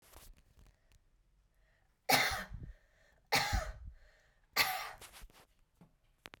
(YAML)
three_cough_length: 6.4 s
three_cough_amplitude: 6731
three_cough_signal_mean_std_ratio: 0.35
survey_phase: beta (2021-08-13 to 2022-03-07)
age: 18-44
gender: Female
wearing_mask: 'No'
symptom_runny_or_blocked_nose: true
symptom_sore_throat: true
symptom_headache: true
smoker_status: Never smoked
respiratory_condition_asthma: true
respiratory_condition_other: false
recruitment_source: REACT
submission_delay: 1 day
covid_test_result: Negative
covid_test_method: RT-qPCR